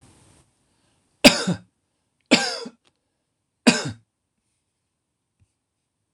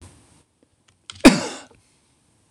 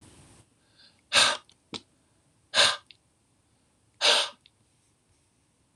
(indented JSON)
{
  "three_cough_length": "6.1 s",
  "three_cough_amplitude": 26028,
  "three_cough_signal_mean_std_ratio": 0.22,
  "cough_length": "2.5 s",
  "cough_amplitude": 26028,
  "cough_signal_mean_std_ratio": 0.2,
  "exhalation_length": "5.8 s",
  "exhalation_amplitude": 17615,
  "exhalation_signal_mean_std_ratio": 0.28,
  "survey_phase": "beta (2021-08-13 to 2022-03-07)",
  "age": "45-64",
  "gender": "Male",
  "wearing_mask": "No",
  "symptom_none": true,
  "smoker_status": "Never smoked",
  "respiratory_condition_asthma": false,
  "respiratory_condition_other": false,
  "recruitment_source": "REACT",
  "submission_delay": "4 days",
  "covid_test_result": "Negative",
  "covid_test_method": "RT-qPCR"
}